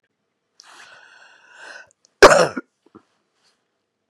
{"cough_length": "4.1 s", "cough_amplitude": 32768, "cough_signal_mean_std_ratio": 0.2, "survey_phase": "beta (2021-08-13 to 2022-03-07)", "age": "65+", "gender": "Female", "wearing_mask": "No", "symptom_cough_any": true, "symptom_runny_or_blocked_nose": true, "symptom_shortness_of_breath": true, "symptom_fatigue": true, "symptom_headache": true, "symptom_other": true, "symptom_onset": "3 days", "smoker_status": "Ex-smoker", "respiratory_condition_asthma": false, "respiratory_condition_other": false, "recruitment_source": "Test and Trace", "submission_delay": "1 day", "covid_test_result": "Positive", "covid_test_method": "RT-qPCR", "covid_ct_value": 23.9, "covid_ct_gene": "N gene", "covid_ct_mean": 24.2, "covid_viral_load": "12000 copies/ml", "covid_viral_load_category": "Low viral load (10K-1M copies/ml)"}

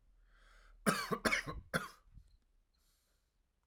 {"cough_length": "3.7 s", "cough_amplitude": 4782, "cough_signal_mean_std_ratio": 0.35, "survey_phase": "alpha (2021-03-01 to 2021-08-12)", "age": "18-44", "gender": "Male", "wearing_mask": "No", "symptom_cough_any": true, "symptom_headache": true, "symptom_onset": "8 days", "smoker_status": "Never smoked", "respiratory_condition_asthma": false, "respiratory_condition_other": false, "recruitment_source": "Test and Trace", "submission_delay": "1 day", "covid_test_result": "Positive", "covid_test_method": "RT-qPCR"}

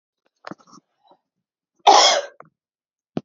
{"cough_length": "3.2 s", "cough_amplitude": 30011, "cough_signal_mean_std_ratio": 0.27, "survey_phase": "beta (2021-08-13 to 2022-03-07)", "age": "18-44", "gender": "Female", "wearing_mask": "No", "symptom_runny_or_blocked_nose": true, "symptom_onset": "8 days", "smoker_status": "Never smoked", "respiratory_condition_asthma": true, "respiratory_condition_other": false, "recruitment_source": "REACT", "submission_delay": "1 day", "covid_test_result": "Negative", "covid_test_method": "RT-qPCR", "influenza_a_test_result": "Negative", "influenza_b_test_result": "Negative"}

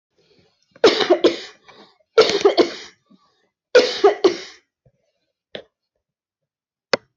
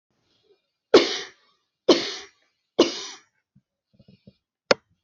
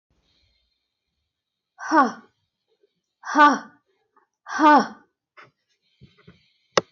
{"cough_length": "7.2 s", "cough_amplitude": 22950, "cough_signal_mean_std_ratio": 0.33, "three_cough_length": "5.0 s", "three_cough_amplitude": 23092, "three_cough_signal_mean_std_ratio": 0.24, "exhalation_length": "6.9 s", "exhalation_amplitude": 22059, "exhalation_signal_mean_std_ratio": 0.26, "survey_phase": "alpha (2021-03-01 to 2021-08-12)", "age": "45-64", "gender": "Female", "wearing_mask": "No", "symptom_none": true, "smoker_status": "Never smoked", "respiratory_condition_asthma": false, "respiratory_condition_other": false, "recruitment_source": "REACT", "submission_delay": "1 day", "covid_test_result": "Negative", "covid_test_method": "RT-qPCR"}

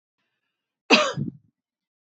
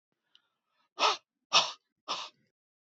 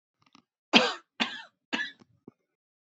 {"cough_length": "2.0 s", "cough_amplitude": 27740, "cough_signal_mean_std_ratio": 0.28, "exhalation_length": "2.8 s", "exhalation_amplitude": 10245, "exhalation_signal_mean_std_ratio": 0.29, "three_cough_length": "2.8 s", "three_cough_amplitude": 25702, "three_cough_signal_mean_std_ratio": 0.27, "survey_phase": "beta (2021-08-13 to 2022-03-07)", "age": "45-64", "gender": "Female", "wearing_mask": "No", "symptom_none": true, "smoker_status": "Ex-smoker", "respiratory_condition_asthma": false, "respiratory_condition_other": false, "recruitment_source": "REACT", "submission_delay": "1 day", "covid_test_result": "Negative", "covid_test_method": "RT-qPCR", "influenza_a_test_result": "Negative", "influenza_b_test_result": "Negative"}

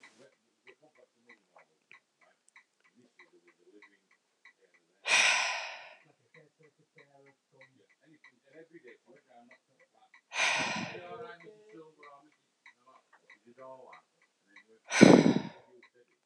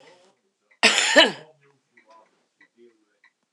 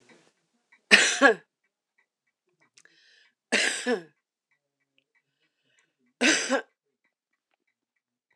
{"exhalation_length": "16.3 s", "exhalation_amplitude": 25885, "exhalation_signal_mean_std_ratio": 0.22, "cough_length": "3.5 s", "cough_amplitude": 26028, "cough_signal_mean_std_ratio": 0.27, "three_cough_length": "8.4 s", "three_cough_amplitude": 26028, "three_cough_signal_mean_std_ratio": 0.27, "survey_phase": "beta (2021-08-13 to 2022-03-07)", "age": "65+", "gender": "Female", "wearing_mask": "No", "symptom_cough_any": true, "symptom_new_continuous_cough": true, "symptom_sore_throat": true, "symptom_fatigue": true, "symptom_other": true, "symptom_onset": "4 days", "smoker_status": "Current smoker (e-cigarettes or vapes only)", "respiratory_condition_asthma": false, "respiratory_condition_other": false, "recruitment_source": "Test and Trace", "submission_delay": "1 day", "covid_test_result": "Positive", "covid_test_method": "RT-qPCR"}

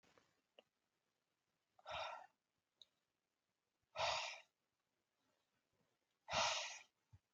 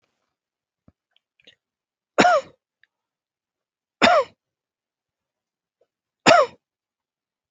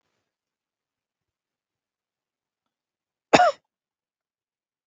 {"exhalation_length": "7.3 s", "exhalation_amplitude": 1573, "exhalation_signal_mean_std_ratio": 0.31, "three_cough_length": "7.5 s", "three_cough_amplitude": 32280, "three_cough_signal_mean_std_ratio": 0.23, "cough_length": "4.9 s", "cough_amplitude": 32768, "cough_signal_mean_std_ratio": 0.14, "survey_phase": "beta (2021-08-13 to 2022-03-07)", "age": "18-44", "gender": "Male", "wearing_mask": "No", "symptom_none": true, "smoker_status": "Never smoked", "respiratory_condition_asthma": false, "respiratory_condition_other": false, "recruitment_source": "REACT", "submission_delay": "6 days", "covid_test_result": "Negative", "covid_test_method": "RT-qPCR", "influenza_a_test_result": "Negative", "influenza_b_test_result": "Negative"}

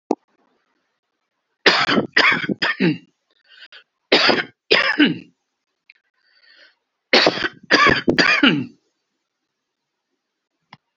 {"three_cough_length": "11.0 s", "three_cough_amplitude": 31363, "three_cough_signal_mean_std_ratio": 0.4, "survey_phase": "beta (2021-08-13 to 2022-03-07)", "age": "65+", "gender": "Male", "wearing_mask": "No", "symptom_none": true, "smoker_status": "Never smoked", "respiratory_condition_asthma": false, "respiratory_condition_other": false, "recruitment_source": "REACT", "submission_delay": "1 day", "covid_test_result": "Negative", "covid_test_method": "RT-qPCR", "influenza_a_test_result": "Unknown/Void", "influenza_b_test_result": "Unknown/Void"}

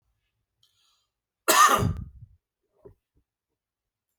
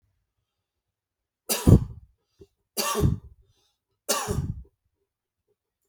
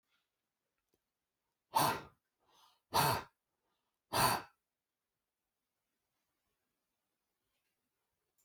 {"cough_length": "4.2 s", "cough_amplitude": 18853, "cough_signal_mean_std_ratio": 0.27, "three_cough_length": "5.9 s", "three_cough_amplitude": 26891, "three_cough_signal_mean_std_ratio": 0.27, "exhalation_length": "8.4 s", "exhalation_amplitude": 4229, "exhalation_signal_mean_std_ratio": 0.24, "survey_phase": "beta (2021-08-13 to 2022-03-07)", "age": "65+", "gender": "Male", "wearing_mask": "No", "symptom_none": true, "smoker_status": "Never smoked", "respiratory_condition_asthma": false, "respiratory_condition_other": false, "recruitment_source": "REACT", "submission_delay": "1 day", "covid_test_result": "Negative", "covid_test_method": "RT-qPCR", "influenza_a_test_result": "Negative", "influenza_b_test_result": "Negative"}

